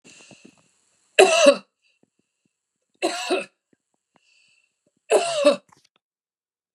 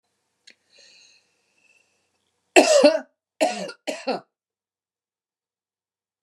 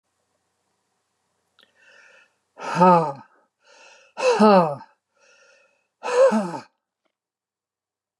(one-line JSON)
{"three_cough_length": "6.7 s", "three_cough_amplitude": 32768, "three_cough_signal_mean_std_ratio": 0.29, "cough_length": "6.2 s", "cough_amplitude": 32736, "cough_signal_mean_std_ratio": 0.26, "exhalation_length": "8.2 s", "exhalation_amplitude": 21792, "exhalation_signal_mean_std_ratio": 0.33, "survey_phase": "beta (2021-08-13 to 2022-03-07)", "age": "65+", "gender": "Female", "wearing_mask": "No", "symptom_none": true, "smoker_status": "Ex-smoker", "respiratory_condition_asthma": false, "respiratory_condition_other": false, "recruitment_source": "Test and Trace", "submission_delay": "1 day", "covid_test_result": "Negative", "covid_test_method": "RT-qPCR"}